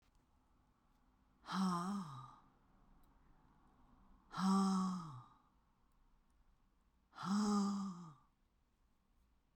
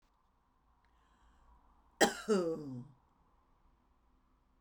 exhalation_length: 9.6 s
exhalation_amplitude: 1489
exhalation_signal_mean_std_ratio: 0.44
cough_length: 4.6 s
cough_amplitude: 7758
cough_signal_mean_std_ratio: 0.28
survey_phase: beta (2021-08-13 to 2022-03-07)
age: 65+
gender: Female
wearing_mask: 'No'
symptom_none: true
smoker_status: Never smoked
respiratory_condition_asthma: false
respiratory_condition_other: false
recruitment_source: REACT
submission_delay: 1 day
covid_test_result: Negative
covid_test_method: RT-qPCR
influenza_a_test_result: Negative
influenza_b_test_result: Negative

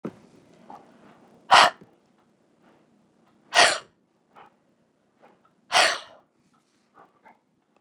exhalation_length: 7.8 s
exhalation_amplitude: 26669
exhalation_signal_mean_std_ratio: 0.23
survey_phase: beta (2021-08-13 to 2022-03-07)
age: 65+
gender: Female
wearing_mask: 'No'
symptom_runny_or_blocked_nose: true
smoker_status: Ex-smoker
respiratory_condition_asthma: false
respiratory_condition_other: false
recruitment_source: REACT
submission_delay: 4 days
covid_test_result: Negative
covid_test_method: RT-qPCR
influenza_a_test_result: Negative
influenza_b_test_result: Negative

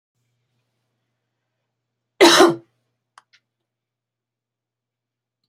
cough_length: 5.5 s
cough_amplitude: 32184
cough_signal_mean_std_ratio: 0.2
survey_phase: beta (2021-08-13 to 2022-03-07)
age: 45-64
gender: Female
wearing_mask: 'No'
symptom_none: true
smoker_status: Never smoked
respiratory_condition_asthma: false
respiratory_condition_other: false
recruitment_source: REACT
submission_delay: 1 day
covid_test_result: Negative
covid_test_method: RT-qPCR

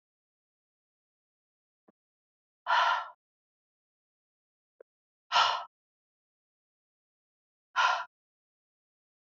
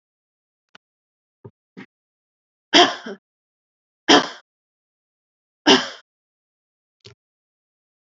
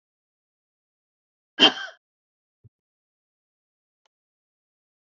exhalation_length: 9.2 s
exhalation_amplitude: 8853
exhalation_signal_mean_std_ratio: 0.24
three_cough_length: 8.2 s
three_cough_amplitude: 31742
three_cough_signal_mean_std_ratio: 0.2
cough_length: 5.1 s
cough_amplitude: 27178
cough_signal_mean_std_ratio: 0.13
survey_phase: beta (2021-08-13 to 2022-03-07)
age: 45-64
gender: Female
wearing_mask: 'No'
symptom_none: true
smoker_status: Ex-smoker
respiratory_condition_asthma: false
respiratory_condition_other: false
recruitment_source: REACT
submission_delay: 6 days
covid_test_result: Negative
covid_test_method: RT-qPCR
influenza_a_test_result: Negative
influenza_b_test_result: Negative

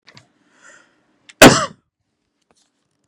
cough_length: 3.1 s
cough_amplitude: 32768
cough_signal_mean_std_ratio: 0.2
survey_phase: beta (2021-08-13 to 2022-03-07)
age: 18-44
gender: Male
wearing_mask: 'No'
symptom_none: true
smoker_status: Prefer not to say
respiratory_condition_asthma: false
respiratory_condition_other: false
recruitment_source: REACT
submission_delay: 0 days
covid_test_result: Negative
covid_test_method: RT-qPCR
influenza_a_test_result: Unknown/Void
influenza_b_test_result: Unknown/Void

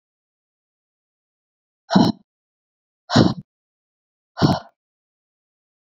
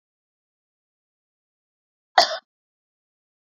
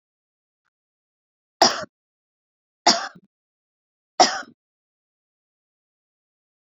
exhalation_length: 6.0 s
exhalation_amplitude: 28013
exhalation_signal_mean_std_ratio: 0.24
cough_length: 3.4 s
cough_amplitude: 27486
cough_signal_mean_std_ratio: 0.14
three_cough_length: 6.7 s
three_cough_amplitude: 27873
three_cough_signal_mean_std_ratio: 0.19
survey_phase: beta (2021-08-13 to 2022-03-07)
age: 18-44
gender: Female
wearing_mask: 'No'
symptom_none: true
smoker_status: Current smoker (1 to 10 cigarettes per day)
respiratory_condition_asthma: false
respiratory_condition_other: false
recruitment_source: REACT
submission_delay: 2 days
covid_test_result: Negative
covid_test_method: RT-qPCR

